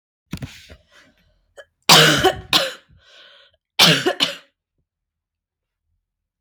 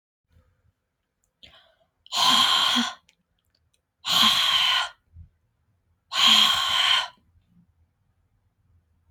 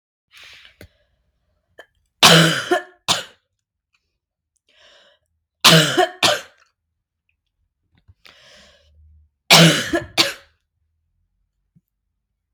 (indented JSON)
{
  "cough_length": "6.4 s",
  "cough_amplitude": 32768,
  "cough_signal_mean_std_ratio": 0.32,
  "exhalation_length": "9.1 s",
  "exhalation_amplitude": 18520,
  "exhalation_signal_mean_std_ratio": 0.44,
  "three_cough_length": "12.5 s",
  "three_cough_amplitude": 32768,
  "three_cough_signal_mean_std_ratio": 0.28,
  "survey_phase": "beta (2021-08-13 to 2022-03-07)",
  "age": "18-44",
  "gender": "Female",
  "wearing_mask": "No",
  "symptom_cough_any": true,
  "symptom_runny_or_blocked_nose": true,
  "smoker_status": "Never smoked",
  "respiratory_condition_asthma": false,
  "respiratory_condition_other": false,
  "recruitment_source": "Test and Trace",
  "submission_delay": "-1 day",
  "covid_test_result": "Negative",
  "covid_test_method": "LFT"
}